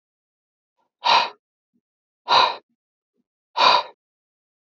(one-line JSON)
{"exhalation_length": "4.7 s", "exhalation_amplitude": 24527, "exhalation_signal_mean_std_ratio": 0.31, "survey_phase": "alpha (2021-03-01 to 2021-08-12)", "age": "18-44", "gender": "Male", "wearing_mask": "No", "symptom_cough_any": true, "symptom_shortness_of_breath": true, "symptom_diarrhoea": true, "symptom_fatigue": true, "symptom_headache": true, "symptom_change_to_sense_of_smell_or_taste": true, "symptom_loss_of_taste": true, "smoker_status": "Current smoker (e-cigarettes or vapes only)", "respiratory_condition_asthma": false, "respiratory_condition_other": false, "recruitment_source": "Test and Trace", "submission_delay": "1 day", "covid_test_result": "Positive", "covid_test_method": "LFT"}